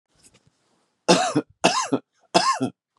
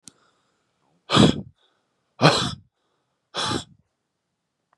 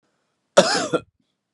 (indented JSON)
{
  "three_cough_length": "3.0 s",
  "three_cough_amplitude": 30749,
  "three_cough_signal_mean_std_ratio": 0.42,
  "exhalation_length": "4.8 s",
  "exhalation_amplitude": 26900,
  "exhalation_signal_mean_std_ratio": 0.29,
  "cough_length": "1.5 s",
  "cough_amplitude": 32748,
  "cough_signal_mean_std_ratio": 0.33,
  "survey_phase": "beta (2021-08-13 to 2022-03-07)",
  "age": "45-64",
  "gender": "Male",
  "wearing_mask": "No",
  "symptom_runny_or_blocked_nose": true,
  "symptom_sore_throat": true,
  "symptom_diarrhoea": true,
  "symptom_fatigue": true,
  "symptom_fever_high_temperature": true,
  "symptom_onset": "4 days",
  "smoker_status": "Current smoker (1 to 10 cigarettes per day)",
  "respiratory_condition_asthma": false,
  "respiratory_condition_other": false,
  "recruitment_source": "Test and Trace",
  "submission_delay": "1 day",
  "covid_test_result": "Positive",
  "covid_test_method": "RT-qPCR",
  "covid_ct_value": 19.9,
  "covid_ct_gene": "ORF1ab gene"
}